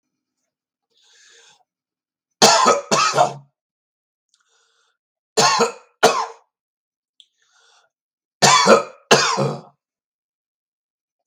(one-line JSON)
{"three_cough_length": "11.3 s", "three_cough_amplitude": 32768, "three_cough_signal_mean_std_ratio": 0.34, "survey_phase": "beta (2021-08-13 to 2022-03-07)", "age": "65+", "gender": "Male", "wearing_mask": "No", "symptom_none": true, "smoker_status": "Ex-smoker", "respiratory_condition_asthma": false, "respiratory_condition_other": false, "recruitment_source": "REACT", "submission_delay": "3 days", "covid_test_result": "Negative", "covid_test_method": "RT-qPCR", "influenza_a_test_result": "Negative", "influenza_b_test_result": "Negative"}